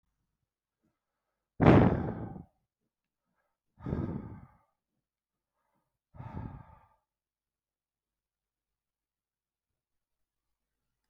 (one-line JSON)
{"exhalation_length": "11.1 s", "exhalation_amplitude": 16112, "exhalation_signal_mean_std_ratio": 0.2, "survey_phase": "beta (2021-08-13 to 2022-03-07)", "age": "45-64", "gender": "Male", "wearing_mask": "No", "symptom_diarrhoea": true, "symptom_fever_high_temperature": true, "symptom_headache": true, "symptom_onset": "3 days", "smoker_status": "Never smoked", "respiratory_condition_asthma": false, "respiratory_condition_other": false, "recruitment_source": "Test and Trace", "submission_delay": "1 day", "covid_test_result": "Positive", "covid_test_method": "RT-qPCR", "covid_ct_value": 18.9, "covid_ct_gene": "ORF1ab gene"}